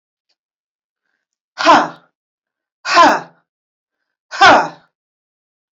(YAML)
exhalation_length: 5.7 s
exhalation_amplitude: 29103
exhalation_signal_mean_std_ratio: 0.31
survey_phase: beta (2021-08-13 to 2022-03-07)
age: 45-64
gender: Female
wearing_mask: 'No'
symptom_none: true
smoker_status: Never smoked
respiratory_condition_asthma: false
respiratory_condition_other: false
recruitment_source: REACT
submission_delay: 0 days
covid_test_result: Negative
covid_test_method: RT-qPCR